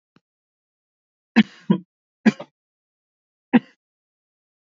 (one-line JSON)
{"three_cough_length": "4.6 s", "three_cough_amplitude": 26659, "three_cough_signal_mean_std_ratio": 0.18, "survey_phase": "alpha (2021-03-01 to 2021-08-12)", "age": "18-44", "gender": "Male", "wearing_mask": "No", "symptom_new_continuous_cough": true, "symptom_fatigue": true, "symptom_headache": true, "symptom_onset": "2 days", "smoker_status": "Never smoked", "respiratory_condition_asthma": false, "respiratory_condition_other": false, "recruitment_source": "Test and Trace", "submission_delay": "1 day", "covid_test_result": "Positive", "covid_test_method": "RT-qPCR", "covid_ct_value": 28.1, "covid_ct_gene": "ORF1ab gene", "covid_ct_mean": 29.4, "covid_viral_load": "220 copies/ml", "covid_viral_load_category": "Minimal viral load (< 10K copies/ml)"}